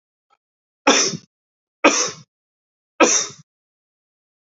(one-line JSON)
{"three_cough_length": "4.4 s", "three_cough_amplitude": 28897, "three_cough_signal_mean_std_ratio": 0.32, "survey_phase": "beta (2021-08-13 to 2022-03-07)", "age": "45-64", "gender": "Male", "wearing_mask": "No", "symptom_cough_any": true, "symptom_runny_or_blocked_nose": true, "symptom_fatigue": true, "symptom_headache": true, "symptom_change_to_sense_of_smell_or_taste": true, "symptom_loss_of_taste": true, "symptom_onset": "8 days", "smoker_status": "Never smoked", "respiratory_condition_asthma": false, "respiratory_condition_other": false, "recruitment_source": "Test and Trace", "submission_delay": "2 days", "covid_test_result": "Positive", "covid_test_method": "RT-qPCR", "covid_ct_value": 16.7, "covid_ct_gene": "ORF1ab gene", "covid_ct_mean": 18.0, "covid_viral_load": "1200000 copies/ml", "covid_viral_load_category": "High viral load (>1M copies/ml)"}